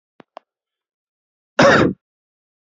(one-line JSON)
{"cough_length": "2.7 s", "cough_amplitude": 28216, "cough_signal_mean_std_ratio": 0.28, "survey_phase": "beta (2021-08-13 to 2022-03-07)", "age": "18-44", "gender": "Male", "wearing_mask": "No", "symptom_cough_any": true, "symptom_runny_or_blocked_nose": true, "symptom_shortness_of_breath": true, "symptom_fatigue": true, "symptom_fever_high_temperature": true, "symptom_headache": true, "smoker_status": "Never smoked", "respiratory_condition_asthma": false, "respiratory_condition_other": false, "recruitment_source": "Test and Trace", "submission_delay": "-1 day", "covid_test_result": "Positive", "covid_test_method": "LFT"}